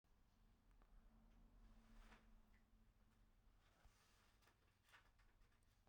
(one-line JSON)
{"cough_length": "5.9 s", "cough_amplitude": 56, "cough_signal_mean_std_ratio": 1.01, "survey_phase": "beta (2021-08-13 to 2022-03-07)", "age": "45-64", "gender": "Male", "wearing_mask": "No", "symptom_cough_any": true, "symptom_runny_or_blocked_nose": true, "symptom_shortness_of_breath": true, "symptom_sore_throat": true, "symptom_diarrhoea": true, "symptom_fatigue": true, "symptom_fever_high_temperature": true, "symptom_headache": true, "symptom_other": true, "symptom_onset": "3 days", "smoker_status": "Ex-smoker", "respiratory_condition_asthma": false, "respiratory_condition_other": false, "recruitment_source": "Test and Trace", "submission_delay": "2 days", "covid_test_result": "Positive", "covid_test_method": "RT-qPCR"}